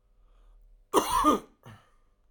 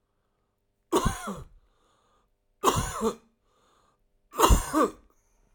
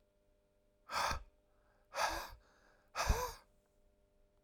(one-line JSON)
{"cough_length": "2.3 s", "cough_amplitude": 11991, "cough_signal_mean_std_ratio": 0.37, "three_cough_length": "5.5 s", "three_cough_amplitude": 21047, "three_cough_signal_mean_std_ratio": 0.35, "exhalation_length": "4.4 s", "exhalation_amplitude": 3410, "exhalation_signal_mean_std_ratio": 0.38, "survey_phase": "alpha (2021-03-01 to 2021-08-12)", "age": "45-64", "gender": "Male", "wearing_mask": "No", "symptom_none": true, "symptom_onset": "11 days", "smoker_status": "Ex-smoker", "respiratory_condition_asthma": false, "respiratory_condition_other": false, "recruitment_source": "REACT", "submission_delay": "3 days", "covid_test_result": "Negative", "covid_test_method": "RT-qPCR"}